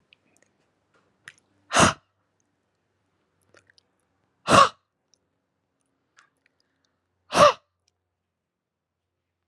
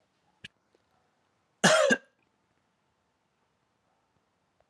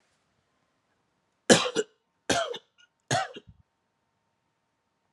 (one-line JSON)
{"exhalation_length": "9.5 s", "exhalation_amplitude": 25279, "exhalation_signal_mean_std_ratio": 0.19, "cough_length": "4.7 s", "cough_amplitude": 15556, "cough_signal_mean_std_ratio": 0.22, "three_cough_length": "5.1 s", "three_cough_amplitude": 25790, "three_cough_signal_mean_std_ratio": 0.25, "survey_phase": "beta (2021-08-13 to 2022-03-07)", "age": "18-44", "gender": "Male", "wearing_mask": "No", "symptom_fatigue": true, "symptom_onset": "3 days", "smoker_status": "Current smoker (11 or more cigarettes per day)", "respiratory_condition_asthma": true, "respiratory_condition_other": false, "recruitment_source": "REACT", "submission_delay": "1 day", "covid_test_result": "Negative", "covid_test_method": "RT-qPCR"}